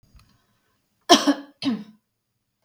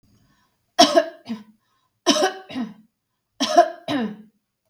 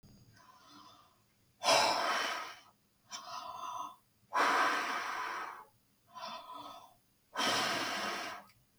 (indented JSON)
{
  "cough_length": "2.6 s",
  "cough_amplitude": 32767,
  "cough_signal_mean_std_ratio": 0.27,
  "three_cough_length": "4.7 s",
  "three_cough_amplitude": 32768,
  "three_cough_signal_mean_std_ratio": 0.36,
  "exhalation_length": "8.8 s",
  "exhalation_amplitude": 5951,
  "exhalation_signal_mean_std_ratio": 0.55,
  "survey_phase": "beta (2021-08-13 to 2022-03-07)",
  "age": "18-44",
  "gender": "Female",
  "wearing_mask": "No",
  "symptom_runny_or_blocked_nose": true,
  "symptom_sore_throat": true,
  "symptom_onset": "8 days",
  "smoker_status": "Ex-smoker",
  "respiratory_condition_asthma": false,
  "respiratory_condition_other": false,
  "recruitment_source": "REACT",
  "submission_delay": "1 day",
  "covid_test_result": "Negative",
  "covid_test_method": "RT-qPCR",
  "influenza_a_test_result": "Negative",
  "influenza_b_test_result": "Negative"
}